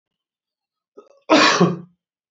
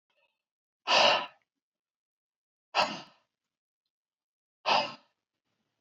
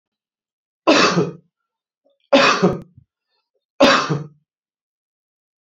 {"cough_length": "2.3 s", "cough_amplitude": 28420, "cough_signal_mean_std_ratio": 0.36, "exhalation_length": "5.8 s", "exhalation_amplitude": 9767, "exhalation_signal_mean_std_ratio": 0.28, "three_cough_length": "5.6 s", "three_cough_amplitude": 28439, "three_cough_signal_mean_std_ratio": 0.37, "survey_phase": "beta (2021-08-13 to 2022-03-07)", "age": "65+", "gender": "Male", "wearing_mask": "No", "symptom_none": true, "smoker_status": "Ex-smoker", "respiratory_condition_asthma": false, "respiratory_condition_other": false, "recruitment_source": "REACT", "submission_delay": "2 days", "covid_test_result": "Negative", "covid_test_method": "RT-qPCR"}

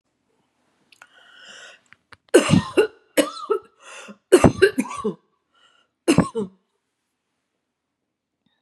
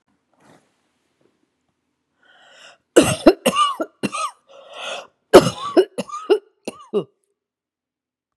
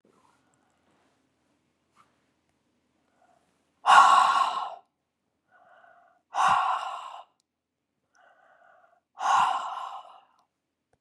{"three_cough_length": "8.6 s", "three_cough_amplitude": 32768, "three_cough_signal_mean_std_ratio": 0.29, "cough_length": "8.4 s", "cough_amplitude": 32768, "cough_signal_mean_std_ratio": 0.28, "exhalation_length": "11.0 s", "exhalation_amplitude": 24114, "exhalation_signal_mean_std_ratio": 0.32, "survey_phase": "beta (2021-08-13 to 2022-03-07)", "age": "65+", "gender": "Female", "wearing_mask": "No", "symptom_none": true, "smoker_status": "Ex-smoker", "respiratory_condition_asthma": false, "respiratory_condition_other": false, "recruitment_source": "REACT", "submission_delay": "2 days", "covid_test_result": "Negative", "covid_test_method": "RT-qPCR", "influenza_a_test_result": "Negative", "influenza_b_test_result": "Negative"}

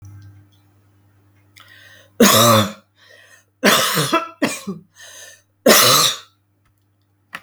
{"three_cough_length": "7.4 s", "three_cough_amplitude": 32768, "three_cough_signal_mean_std_ratio": 0.4, "survey_phase": "beta (2021-08-13 to 2022-03-07)", "age": "45-64", "gender": "Female", "wearing_mask": "No", "symptom_fatigue": true, "smoker_status": "Ex-smoker", "respiratory_condition_asthma": false, "respiratory_condition_other": false, "recruitment_source": "Test and Trace", "submission_delay": "2 days", "covid_test_result": "Positive", "covid_test_method": "RT-qPCR", "covid_ct_value": 33.0, "covid_ct_gene": "ORF1ab gene", "covid_ct_mean": 33.8, "covid_viral_load": "8.3 copies/ml", "covid_viral_load_category": "Minimal viral load (< 10K copies/ml)"}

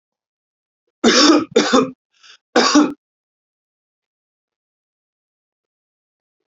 {"three_cough_length": "6.5 s", "three_cough_amplitude": 30670, "three_cough_signal_mean_std_ratio": 0.32, "survey_phase": "beta (2021-08-13 to 2022-03-07)", "age": "18-44", "gender": "Male", "wearing_mask": "No", "symptom_none": true, "smoker_status": "Never smoked", "respiratory_condition_asthma": false, "respiratory_condition_other": false, "recruitment_source": "REACT", "submission_delay": "0 days", "covid_test_result": "Negative", "covid_test_method": "RT-qPCR"}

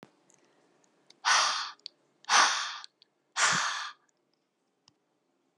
{"exhalation_length": "5.6 s", "exhalation_amplitude": 11336, "exhalation_signal_mean_std_ratio": 0.38, "survey_phase": "alpha (2021-03-01 to 2021-08-12)", "age": "18-44", "gender": "Female", "wearing_mask": "No", "symptom_cough_any": true, "symptom_fatigue": true, "symptom_headache": true, "symptom_change_to_sense_of_smell_or_taste": true, "symptom_onset": "2 days", "smoker_status": "Never smoked", "respiratory_condition_asthma": false, "respiratory_condition_other": false, "recruitment_source": "Test and Trace", "submission_delay": "2 days", "covid_test_result": "Positive", "covid_test_method": "RT-qPCR"}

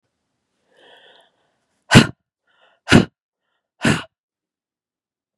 {"exhalation_length": "5.4 s", "exhalation_amplitude": 32768, "exhalation_signal_mean_std_ratio": 0.2, "survey_phase": "beta (2021-08-13 to 2022-03-07)", "age": "18-44", "gender": "Female", "wearing_mask": "No", "symptom_cough_any": true, "symptom_new_continuous_cough": true, "symptom_runny_or_blocked_nose": true, "symptom_shortness_of_breath": true, "symptom_fatigue": true, "symptom_headache": true, "symptom_other": true, "symptom_onset": "3 days", "smoker_status": "Never smoked", "respiratory_condition_asthma": false, "respiratory_condition_other": false, "recruitment_source": "Test and Trace", "submission_delay": "2 days", "covid_test_result": "Positive", "covid_test_method": "RT-qPCR", "covid_ct_value": 30.9, "covid_ct_gene": "ORF1ab gene", "covid_ct_mean": 31.7, "covid_viral_load": "39 copies/ml", "covid_viral_load_category": "Minimal viral load (< 10K copies/ml)"}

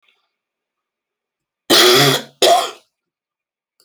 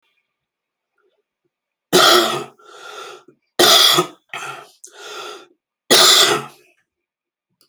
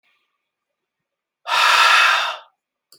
{"cough_length": "3.8 s", "cough_amplitude": 32767, "cough_signal_mean_std_ratio": 0.37, "three_cough_length": "7.7 s", "three_cough_amplitude": 32768, "three_cough_signal_mean_std_ratio": 0.38, "exhalation_length": "3.0 s", "exhalation_amplitude": 27105, "exhalation_signal_mean_std_ratio": 0.45, "survey_phase": "alpha (2021-03-01 to 2021-08-12)", "age": "45-64", "gender": "Male", "wearing_mask": "No", "symptom_cough_any": true, "symptom_new_continuous_cough": true, "symptom_shortness_of_breath": true, "symptom_diarrhoea": true, "symptom_headache": true, "symptom_onset": "4 days", "smoker_status": "Ex-smoker", "respiratory_condition_asthma": false, "respiratory_condition_other": false, "recruitment_source": "REACT", "submission_delay": "1 day", "covid_test_result": "Negative", "covid_test_method": "RT-qPCR"}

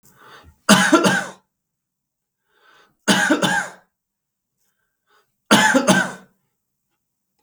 {"three_cough_length": "7.4 s", "three_cough_amplitude": 32768, "three_cough_signal_mean_std_ratio": 0.37, "survey_phase": "beta (2021-08-13 to 2022-03-07)", "age": "45-64", "gender": "Male", "wearing_mask": "No", "symptom_none": true, "smoker_status": "Ex-smoker", "respiratory_condition_asthma": false, "respiratory_condition_other": false, "recruitment_source": "REACT", "submission_delay": "-9 days", "covid_test_result": "Negative", "covid_test_method": "RT-qPCR", "influenza_a_test_result": "Unknown/Void", "influenza_b_test_result": "Unknown/Void"}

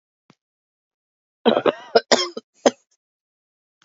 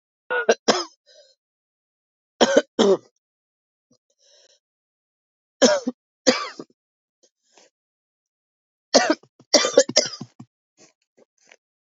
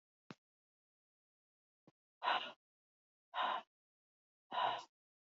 {"cough_length": "3.8 s", "cough_amplitude": 32576, "cough_signal_mean_std_ratio": 0.25, "three_cough_length": "11.9 s", "three_cough_amplitude": 32767, "three_cough_signal_mean_std_ratio": 0.27, "exhalation_length": "5.3 s", "exhalation_amplitude": 2399, "exhalation_signal_mean_std_ratio": 0.31, "survey_phase": "beta (2021-08-13 to 2022-03-07)", "age": "18-44", "gender": "Female", "wearing_mask": "No", "symptom_cough_any": true, "symptom_sore_throat": true, "symptom_fatigue": true, "symptom_other": true, "symptom_onset": "4 days", "smoker_status": "Ex-smoker", "respiratory_condition_asthma": false, "respiratory_condition_other": false, "recruitment_source": "Test and Trace", "submission_delay": "1 day", "covid_test_result": "Positive", "covid_test_method": "RT-qPCR", "covid_ct_value": 19.5, "covid_ct_gene": "ORF1ab gene", "covid_ct_mean": 19.8, "covid_viral_load": "320000 copies/ml", "covid_viral_load_category": "Low viral load (10K-1M copies/ml)"}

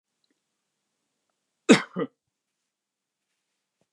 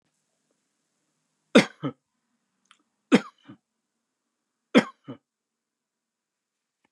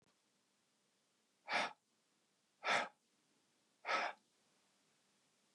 {"cough_length": "3.9 s", "cough_amplitude": 24325, "cough_signal_mean_std_ratio": 0.15, "three_cough_length": "6.9 s", "three_cough_amplitude": 23428, "three_cough_signal_mean_std_ratio": 0.15, "exhalation_length": "5.5 s", "exhalation_amplitude": 2281, "exhalation_signal_mean_std_ratio": 0.29, "survey_phase": "beta (2021-08-13 to 2022-03-07)", "age": "65+", "gender": "Male", "wearing_mask": "No", "symptom_none": true, "smoker_status": "Never smoked", "respiratory_condition_asthma": false, "respiratory_condition_other": false, "recruitment_source": "REACT", "submission_delay": "2 days", "covid_test_result": "Negative", "covid_test_method": "RT-qPCR", "influenza_a_test_result": "Negative", "influenza_b_test_result": "Negative"}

